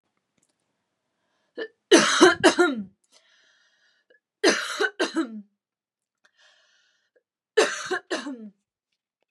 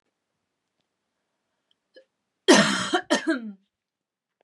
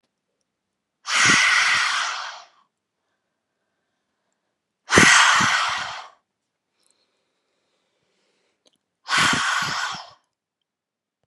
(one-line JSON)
{"three_cough_length": "9.3 s", "three_cough_amplitude": 28700, "three_cough_signal_mean_std_ratio": 0.32, "cough_length": "4.4 s", "cough_amplitude": 26280, "cough_signal_mean_std_ratio": 0.29, "exhalation_length": "11.3 s", "exhalation_amplitude": 32768, "exhalation_signal_mean_std_ratio": 0.4, "survey_phase": "beta (2021-08-13 to 2022-03-07)", "age": "18-44", "gender": "Female", "wearing_mask": "No", "symptom_none": true, "smoker_status": "Ex-smoker", "respiratory_condition_asthma": false, "respiratory_condition_other": false, "recruitment_source": "REACT", "submission_delay": "1 day", "covid_test_result": "Negative", "covid_test_method": "RT-qPCR", "influenza_a_test_result": "Negative", "influenza_b_test_result": "Negative"}